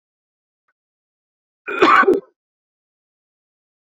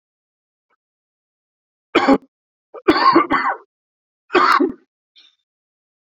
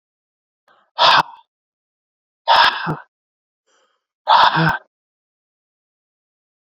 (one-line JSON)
{"cough_length": "3.8 s", "cough_amplitude": 27624, "cough_signal_mean_std_ratio": 0.27, "three_cough_length": "6.1 s", "three_cough_amplitude": 29775, "three_cough_signal_mean_std_ratio": 0.35, "exhalation_length": "6.7 s", "exhalation_amplitude": 31109, "exhalation_signal_mean_std_ratio": 0.33, "survey_phase": "beta (2021-08-13 to 2022-03-07)", "age": "18-44", "gender": "Male", "wearing_mask": "No", "symptom_cough_any": true, "symptom_runny_or_blocked_nose": true, "symptom_sore_throat": true, "symptom_onset": "3 days", "smoker_status": "Never smoked", "respiratory_condition_asthma": false, "respiratory_condition_other": false, "recruitment_source": "Test and Trace", "submission_delay": "2 days", "covid_test_result": "Positive", "covid_test_method": "RT-qPCR"}